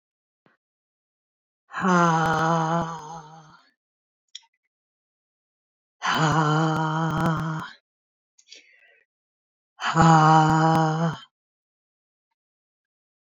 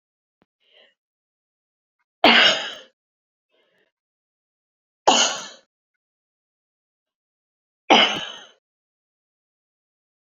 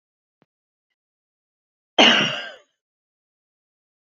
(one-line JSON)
{"exhalation_length": "13.4 s", "exhalation_amplitude": 21160, "exhalation_signal_mean_std_ratio": 0.46, "three_cough_length": "10.2 s", "three_cough_amplitude": 27966, "three_cough_signal_mean_std_ratio": 0.24, "cough_length": "4.2 s", "cough_amplitude": 28484, "cough_signal_mean_std_ratio": 0.23, "survey_phase": "beta (2021-08-13 to 2022-03-07)", "age": "65+", "gender": "Female", "wearing_mask": "No", "symptom_none": true, "smoker_status": "Ex-smoker", "respiratory_condition_asthma": false, "respiratory_condition_other": false, "recruitment_source": "REACT", "submission_delay": "0 days", "covid_test_result": "Negative", "covid_test_method": "RT-qPCR"}